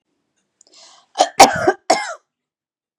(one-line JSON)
{"cough_length": "3.0 s", "cough_amplitude": 32768, "cough_signal_mean_std_ratio": 0.29, "survey_phase": "beta (2021-08-13 to 2022-03-07)", "age": "45-64", "gender": "Female", "wearing_mask": "No", "symptom_none": true, "symptom_onset": "12 days", "smoker_status": "Ex-smoker", "respiratory_condition_asthma": true, "respiratory_condition_other": false, "recruitment_source": "REACT", "submission_delay": "3 days", "covid_test_result": "Negative", "covid_test_method": "RT-qPCR", "influenza_a_test_result": "Negative", "influenza_b_test_result": "Negative"}